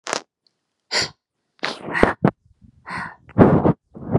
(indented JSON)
{
  "exhalation_length": "4.2 s",
  "exhalation_amplitude": 32768,
  "exhalation_signal_mean_std_ratio": 0.38,
  "survey_phase": "beta (2021-08-13 to 2022-03-07)",
  "age": "45-64",
  "gender": "Female",
  "wearing_mask": "No",
  "symptom_none": true,
  "symptom_onset": "12 days",
  "smoker_status": "Never smoked",
  "respiratory_condition_asthma": false,
  "respiratory_condition_other": false,
  "recruitment_source": "REACT",
  "submission_delay": "1 day",
  "covid_test_result": "Negative",
  "covid_test_method": "RT-qPCR"
}